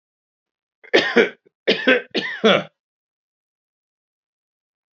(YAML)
three_cough_length: 4.9 s
three_cough_amplitude: 29014
three_cough_signal_mean_std_ratio: 0.32
survey_phase: beta (2021-08-13 to 2022-03-07)
age: 45-64
gender: Male
wearing_mask: 'No'
symptom_runny_or_blocked_nose: true
symptom_fatigue: true
smoker_status: Current smoker (1 to 10 cigarettes per day)
respiratory_condition_asthma: false
respiratory_condition_other: false
recruitment_source: REACT
submission_delay: 1 day
covid_test_result: Negative
covid_test_method: RT-qPCR
influenza_a_test_result: Negative
influenza_b_test_result: Negative